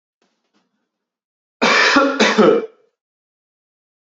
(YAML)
cough_length: 4.2 s
cough_amplitude: 29494
cough_signal_mean_std_ratio: 0.4
survey_phase: beta (2021-08-13 to 2022-03-07)
age: 18-44
gender: Male
wearing_mask: 'No'
symptom_none: true
smoker_status: Never smoked
respiratory_condition_asthma: false
respiratory_condition_other: false
recruitment_source: REACT
submission_delay: 3 days
covid_test_result: Negative
covid_test_method: RT-qPCR
influenza_a_test_result: Negative
influenza_b_test_result: Negative